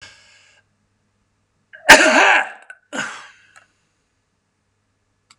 {"cough_length": "5.4 s", "cough_amplitude": 32768, "cough_signal_mean_std_ratio": 0.26, "survey_phase": "beta (2021-08-13 to 2022-03-07)", "age": "65+", "gender": "Male", "wearing_mask": "No", "symptom_none": true, "smoker_status": "Never smoked", "respiratory_condition_asthma": false, "respiratory_condition_other": false, "recruitment_source": "REACT", "submission_delay": "1 day", "covid_test_result": "Negative", "covid_test_method": "RT-qPCR", "influenza_a_test_result": "Negative", "influenza_b_test_result": "Negative"}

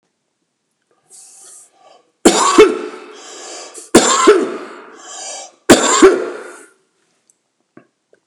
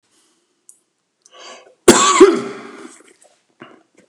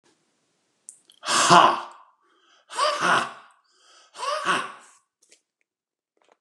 {"three_cough_length": "8.3 s", "three_cough_amplitude": 32768, "three_cough_signal_mean_std_ratio": 0.38, "cough_length": "4.1 s", "cough_amplitude": 32768, "cough_signal_mean_std_ratio": 0.29, "exhalation_length": "6.4 s", "exhalation_amplitude": 29583, "exhalation_signal_mean_std_ratio": 0.35, "survey_phase": "beta (2021-08-13 to 2022-03-07)", "age": "65+", "gender": "Male", "wearing_mask": "No", "symptom_none": true, "smoker_status": "Ex-smoker", "respiratory_condition_asthma": false, "respiratory_condition_other": false, "recruitment_source": "REACT", "submission_delay": "1 day", "covid_test_result": "Negative", "covid_test_method": "RT-qPCR"}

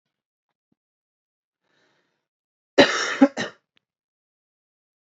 {"cough_length": "5.1 s", "cough_amplitude": 29255, "cough_signal_mean_std_ratio": 0.2, "survey_phase": "alpha (2021-03-01 to 2021-08-12)", "age": "18-44", "gender": "Male", "wearing_mask": "No", "symptom_none": true, "smoker_status": "Never smoked", "respiratory_condition_asthma": false, "respiratory_condition_other": false, "recruitment_source": "REACT", "submission_delay": "1 day", "covid_test_result": "Negative", "covid_test_method": "RT-qPCR"}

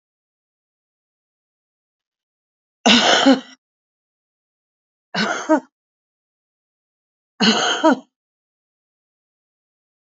{"three_cough_length": "10.1 s", "three_cough_amplitude": 29948, "three_cough_signal_mean_std_ratio": 0.28, "survey_phase": "beta (2021-08-13 to 2022-03-07)", "age": "65+", "gender": "Female", "wearing_mask": "No", "symptom_cough_any": true, "symptom_onset": "12 days", "smoker_status": "Never smoked", "respiratory_condition_asthma": true, "respiratory_condition_other": false, "recruitment_source": "REACT", "submission_delay": "2 days", "covid_test_result": "Negative", "covid_test_method": "RT-qPCR", "influenza_a_test_result": "Unknown/Void", "influenza_b_test_result": "Unknown/Void"}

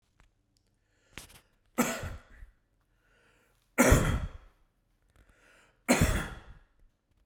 {"three_cough_length": "7.3 s", "three_cough_amplitude": 12939, "three_cough_signal_mean_std_ratio": 0.31, "survey_phase": "beta (2021-08-13 to 2022-03-07)", "age": "45-64", "gender": "Male", "wearing_mask": "No", "symptom_cough_any": true, "symptom_shortness_of_breath": true, "smoker_status": "Ex-smoker", "respiratory_condition_asthma": false, "respiratory_condition_other": false, "recruitment_source": "Test and Trace", "submission_delay": "0 days", "covid_test_result": "Positive", "covid_test_method": "RT-qPCR", "covid_ct_value": 26.6, "covid_ct_gene": "N gene", "covid_ct_mean": 27.2, "covid_viral_load": "1200 copies/ml", "covid_viral_load_category": "Minimal viral load (< 10K copies/ml)"}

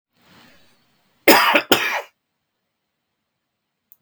{"cough_length": "4.0 s", "cough_amplitude": 32768, "cough_signal_mean_std_ratio": 0.29, "survey_phase": "beta (2021-08-13 to 2022-03-07)", "age": "65+", "gender": "Male", "wearing_mask": "No", "symptom_cough_any": true, "symptom_shortness_of_breath": true, "symptom_onset": "8 days", "smoker_status": "Ex-smoker", "respiratory_condition_asthma": false, "respiratory_condition_other": true, "recruitment_source": "REACT", "submission_delay": "2 days", "covid_test_result": "Negative", "covid_test_method": "RT-qPCR", "influenza_a_test_result": "Negative", "influenza_b_test_result": "Negative"}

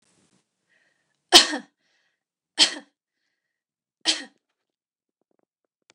{"three_cough_length": "5.9 s", "three_cough_amplitude": 30582, "three_cough_signal_mean_std_ratio": 0.18, "survey_phase": "beta (2021-08-13 to 2022-03-07)", "age": "18-44", "gender": "Female", "wearing_mask": "No", "symptom_none": true, "smoker_status": "Never smoked", "respiratory_condition_asthma": false, "respiratory_condition_other": false, "recruitment_source": "REACT", "submission_delay": "1 day", "covid_test_result": "Negative", "covid_test_method": "RT-qPCR", "influenza_a_test_result": "Negative", "influenza_b_test_result": "Negative"}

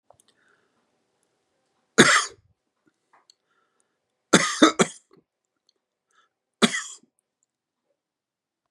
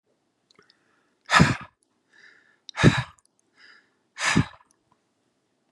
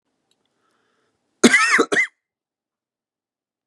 {"three_cough_length": "8.7 s", "three_cough_amplitude": 32767, "three_cough_signal_mean_std_ratio": 0.21, "exhalation_length": "5.7 s", "exhalation_amplitude": 27148, "exhalation_signal_mean_std_ratio": 0.26, "cough_length": "3.7 s", "cough_amplitude": 32339, "cough_signal_mean_std_ratio": 0.29, "survey_phase": "beta (2021-08-13 to 2022-03-07)", "age": "18-44", "gender": "Male", "wearing_mask": "No", "symptom_none": true, "smoker_status": "Never smoked", "respiratory_condition_asthma": false, "respiratory_condition_other": false, "recruitment_source": "REACT", "submission_delay": "1 day", "covid_test_result": "Negative", "covid_test_method": "RT-qPCR", "influenza_a_test_result": "Negative", "influenza_b_test_result": "Negative"}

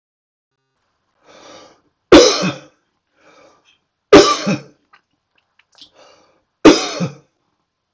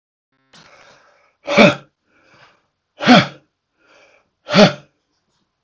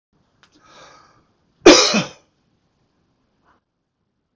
{"three_cough_length": "7.9 s", "three_cough_amplitude": 32768, "three_cough_signal_mean_std_ratio": 0.27, "exhalation_length": "5.6 s", "exhalation_amplitude": 32768, "exhalation_signal_mean_std_ratio": 0.27, "cough_length": "4.4 s", "cough_amplitude": 32768, "cough_signal_mean_std_ratio": 0.21, "survey_phase": "beta (2021-08-13 to 2022-03-07)", "age": "65+", "gender": "Male", "wearing_mask": "No", "symptom_none": true, "smoker_status": "Ex-smoker", "respiratory_condition_asthma": false, "respiratory_condition_other": false, "recruitment_source": "REACT", "submission_delay": "2 days", "covid_test_result": "Negative", "covid_test_method": "RT-qPCR"}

